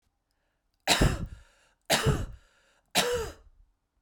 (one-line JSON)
{"three_cough_length": "4.0 s", "three_cough_amplitude": 16254, "three_cough_signal_mean_std_ratio": 0.41, "survey_phase": "beta (2021-08-13 to 2022-03-07)", "age": "18-44", "gender": "Female", "wearing_mask": "No", "symptom_cough_any": true, "symptom_runny_or_blocked_nose": true, "symptom_fatigue": true, "symptom_fever_high_temperature": true, "symptom_change_to_sense_of_smell_or_taste": true, "symptom_loss_of_taste": true, "symptom_onset": "3 days", "smoker_status": "Never smoked", "respiratory_condition_asthma": false, "respiratory_condition_other": false, "recruitment_source": "Test and Trace", "submission_delay": "2 days", "covid_test_result": "Positive", "covid_test_method": "RT-qPCR", "covid_ct_value": 16.2, "covid_ct_gene": "ORF1ab gene", "covid_ct_mean": 16.7, "covid_viral_load": "3300000 copies/ml", "covid_viral_load_category": "High viral load (>1M copies/ml)"}